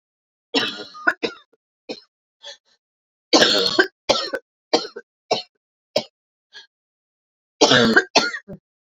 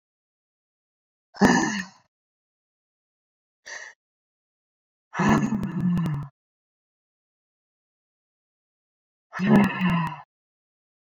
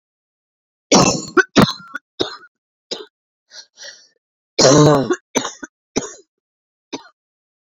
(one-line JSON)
{"three_cough_length": "8.9 s", "three_cough_amplitude": 30876, "three_cough_signal_mean_std_ratio": 0.35, "exhalation_length": "11.0 s", "exhalation_amplitude": 23819, "exhalation_signal_mean_std_ratio": 0.35, "cough_length": "7.7 s", "cough_amplitude": 31665, "cough_signal_mean_std_ratio": 0.34, "survey_phase": "beta (2021-08-13 to 2022-03-07)", "age": "18-44", "gender": "Female", "wearing_mask": "No", "symptom_cough_any": true, "symptom_new_continuous_cough": true, "symptom_runny_or_blocked_nose": true, "symptom_shortness_of_breath": true, "symptom_sore_throat": true, "symptom_fatigue": true, "symptom_headache": true, "symptom_change_to_sense_of_smell_or_taste": true, "symptom_loss_of_taste": true, "smoker_status": "Current smoker (1 to 10 cigarettes per day)", "respiratory_condition_asthma": false, "respiratory_condition_other": false, "recruitment_source": "Test and Trace", "submission_delay": "2 days", "covid_test_result": "Positive", "covid_test_method": "RT-qPCR"}